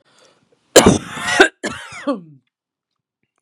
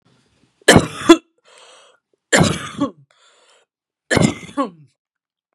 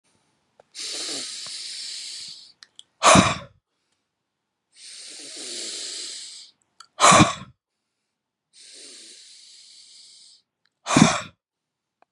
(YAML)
cough_length: 3.4 s
cough_amplitude: 32768
cough_signal_mean_std_ratio: 0.32
three_cough_length: 5.5 s
three_cough_amplitude: 32768
three_cough_signal_mean_std_ratio: 0.3
exhalation_length: 12.1 s
exhalation_amplitude: 32216
exhalation_signal_mean_std_ratio: 0.29
survey_phase: beta (2021-08-13 to 2022-03-07)
age: 45-64
gender: Female
wearing_mask: 'No'
symptom_cough_any: true
symptom_shortness_of_breath: true
symptom_fatigue: true
symptom_onset: 2 days
smoker_status: Never smoked
respiratory_condition_asthma: false
respiratory_condition_other: false
recruitment_source: Test and Trace
submission_delay: 1 day
covid_test_result: Negative
covid_test_method: LAMP